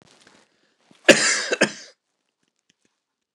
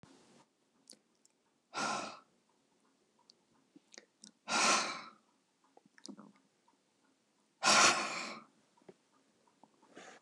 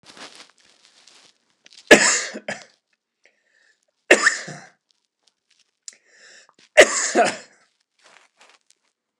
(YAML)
cough_length: 3.3 s
cough_amplitude: 29204
cough_signal_mean_std_ratio: 0.26
exhalation_length: 10.2 s
exhalation_amplitude: 7298
exhalation_signal_mean_std_ratio: 0.29
three_cough_length: 9.2 s
three_cough_amplitude: 29204
three_cough_signal_mean_std_ratio: 0.24
survey_phase: beta (2021-08-13 to 2022-03-07)
age: 65+
gender: Male
wearing_mask: 'No'
symptom_none: true
smoker_status: Never smoked
respiratory_condition_asthma: false
respiratory_condition_other: false
recruitment_source: REACT
submission_delay: 1 day
covid_test_result: Negative
covid_test_method: RT-qPCR